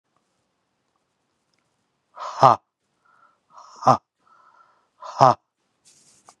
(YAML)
exhalation_length: 6.4 s
exhalation_amplitude: 32768
exhalation_signal_mean_std_ratio: 0.19
survey_phase: beta (2021-08-13 to 2022-03-07)
age: 45-64
gender: Male
wearing_mask: 'No'
symptom_cough_any: true
symptom_runny_or_blocked_nose: true
symptom_sore_throat: true
symptom_diarrhoea: true
symptom_fatigue: true
symptom_fever_high_temperature: true
symptom_headache: true
symptom_onset: 2 days
smoker_status: Never smoked
respiratory_condition_asthma: false
respiratory_condition_other: false
recruitment_source: Test and Trace
submission_delay: 2 days
covid_test_result: Positive
covid_test_method: RT-qPCR
covid_ct_value: 20.1
covid_ct_gene: ORF1ab gene
covid_ct_mean: 20.3
covid_viral_load: 220000 copies/ml
covid_viral_load_category: Low viral load (10K-1M copies/ml)